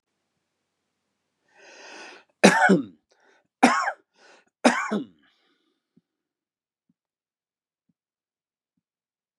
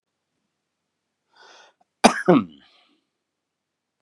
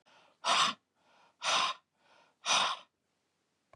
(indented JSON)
{
  "three_cough_length": "9.4 s",
  "three_cough_amplitude": 32738,
  "three_cough_signal_mean_std_ratio": 0.24,
  "cough_length": "4.0 s",
  "cough_amplitude": 32767,
  "cough_signal_mean_std_ratio": 0.19,
  "exhalation_length": "3.8 s",
  "exhalation_amplitude": 5439,
  "exhalation_signal_mean_std_ratio": 0.41,
  "survey_phase": "beta (2021-08-13 to 2022-03-07)",
  "age": "45-64",
  "gender": "Male",
  "wearing_mask": "No",
  "symptom_none": true,
  "smoker_status": "Ex-smoker",
  "respiratory_condition_asthma": false,
  "respiratory_condition_other": false,
  "recruitment_source": "Test and Trace",
  "submission_delay": "2 days",
  "covid_test_result": "Negative",
  "covid_test_method": "RT-qPCR"
}